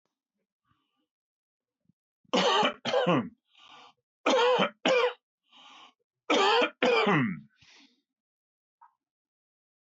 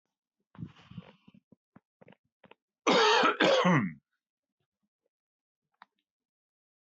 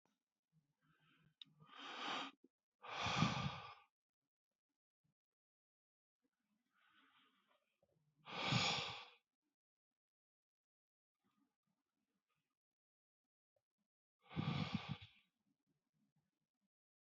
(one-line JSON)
{"three_cough_length": "9.8 s", "three_cough_amplitude": 13979, "three_cough_signal_mean_std_ratio": 0.43, "cough_length": "6.8 s", "cough_amplitude": 8988, "cough_signal_mean_std_ratio": 0.33, "exhalation_length": "17.1 s", "exhalation_amplitude": 2283, "exhalation_signal_mean_std_ratio": 0.29, "survey_phase": "beta (2021-08-13 to 2022-03-07)", "age": "65+", "gender": "Male", "wearing_mask": "No", "symptom_none": true, "smoker_status": "Ex-smoker", "respiratory_condition_asthma": false, "respiratory_condition_other": false, "recruitment_source": "REACT", "submission_delay": "2 days", "covid_test_result": "Negative", "covid_test_method": "RT-qPCR"}